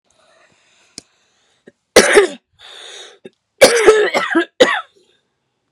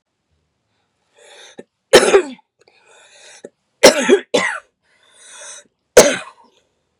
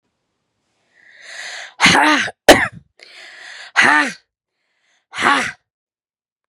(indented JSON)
{
  "cough_length": "5.7 s",
  "cough_amplitude": 32768,
  "cough_signal_mean_std_ratio": 0.37,
  "three_cough_length": "7.0 s",
  "three_cough_amplitude": 32768,
  "three_cough_signal_mean_std_ratio": 0.29,
  "exhalation_length": "6.5 s",
  "exhalation_amplitude": 32768,
  "exhalation_signal_mean_std_ratio": 0.36,
  "survey_phase": "beta (2021-08-13 to 2022-03-07)",
  "age": "18-44",
  "gender": "Female",
  "wearing_mask": "No",
  "symptom_cough_any": true,
  "symptom_runny_or_blocked_nose": true,
  "symptom_sore_throat": true,
  "symptom_headache": true,
  "smoker_status": "Never smoked",
  "respiratory_condition_asthma": false,
  "respiratory_condition_other": false,
  "recruitment_source": "Test and Trace",
  "submission_delay": "1 day",
  "covid_test_result": "Positive",
  "covid_test_method": "RT-qPCR",
  "covid_ct_value": 21.7,
  "covid_ct_gene": "ORF1ab gene",
  "covid_ct_mean": 22.7,
  "covid_viral_load": "35000 copies/ml",
  "covid_viral_load_category": "Low viral load (10K-1M copies/ml)"
}